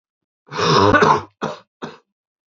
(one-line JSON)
{"three_cough_length": "2.5 s", "three_cough_amplitude": 28261, "three_cough_signal_mean_std_ratio": 0.45, "survey_phase": "beta (2021-08-13 to 2022-03-07)", "age": "18-44", "gender": "Male", "wearing_mask": "No", "symptom_cough_any": true, "symptom_runny_or_blocked_nose": true, "symptom_diarrhoea": true, "symptom_other": true, "symptom_onset": "3 days", "smoker_status": "Never smoked", "respiratory_condition_asthma": false, "respiratory_condition_other": false, "recruitment_source": "Test and Trace", "submission_delay": "2 days", "covid_test_result": "Positive", "covid_test_method": "ePCR"}